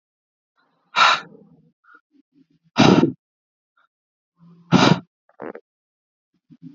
{
  "exhalation_length": "6.7 s",
  "exhalation_amplitude": 30622,
  "exhalation_signal_mean_std_ratio": 0.28,
  "survey_phase": "alpha (2021-03-01 to 2021-08-12)",
  "age": "18-44",
  "gender": "Male",
  "wearing_mask": "Yes",
  "symptom_cough_any": true,
  "symptom_fatigue": true,
  "symptom_headache": true,
  "symptom_change_to_sense_of_smell_or_taste": true,
  "symptom_loss_of_taste": true,
  "smoker_status": "Prefer not to say",
  "respiratory_condition_asthma": false,
  "respiratory_condition_other": false,
  "recruitment_source": "Test and Trace",
  "submission_delay": "2 days",
  "covid_test_result": "Positive",
  "covid_test_method": "RT-qPCR"
}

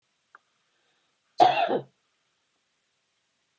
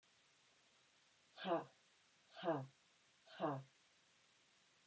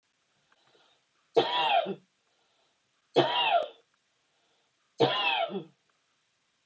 {
  "cough_length": "3.6 s",
  "cough_amplitude": 17842,
  "cough_signal_mean_std_ratio": 0.24,
  "exhalation_length": "4.9 s",
  "exhalation_amplitude": 1146,
  "exhalation_signal_mean_std_ratio": 0.34,
  "three_cough_length": "6.7 s",
  "three_cough_amplitude": 11185,
  "three_cough_signal_mean_std_ratio": 0.4,
  "survey_phase": "alpha (2021-03-01 to 2021-08-12)",
  "age": "45-64",
  "gender": "Female",
  "wearing_mask": "No",
  "symptom_none": true,
  "smoker_status": "Ex-smoker",
  "respiratory_condition_asthma": false,
  "respiratory_condition_other": false,
  "recruitment_source": "REACT",
  "submission_delay": "2 days",
  "covid_test_result": "Negative",
  "covid_test_method": "RT-qPCR"
}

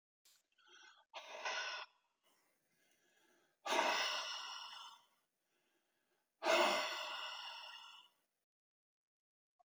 {
  "exhalation_length": "9.6 s",
  "exhalation_amplitude": 2985,
  "exhalation_signal_mean_std_ratio": 0.4,
  "survey_phase": "beta (2021-08-13 to 2022-03-07)",
  "age": "65+",
  "gender": "Male",
  "wearing_mask": "No",
  "symptom_none": true,
  "smoker_status": "Never smoked",
  "respiratory_condition_asthma": false,
  "respiratory_condition_other": false,
  "recruitment_source": "REACT",
  "submission_delay": "2 days",
  "covid_test_result": "Negative",
  "covid_test_method": "RT-qPCR",
  "influenza_a_test_result": "Negative",
  "influenza_b_test_result": "Negative"
}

